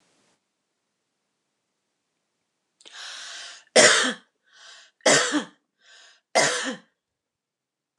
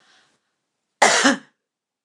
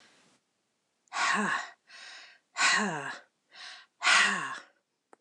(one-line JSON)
{"three_cough_length": "8.0 s", "three_cough_amplitude": 26132, "three_cough_signal_mean_std_ratio": 0.29, "cough_length": "2.0 s", "cough_amplitude": 29203, "cough_signal_mean_std_ratio": 0.32, "exhalation_length": "5.2 s", "exhalation_amplitude": 11231, "exhalation_signal_mean_std_ratio": 0.45, "survey_phase": "beta (2021-08-13 to 2022-03-07)", "age": "45-64", "gender": "Female", "wearing_mask": "No", "symptom_none": true, "smoker_status": "Never smoked", "respiratory_condition_asthma": false, "respiratory_condition_other": false, "recruitment_source": "REACT", "submission_delay": "1 day", "covid_test_result": "Negative", "covid_test_method": "RT-qPCR"}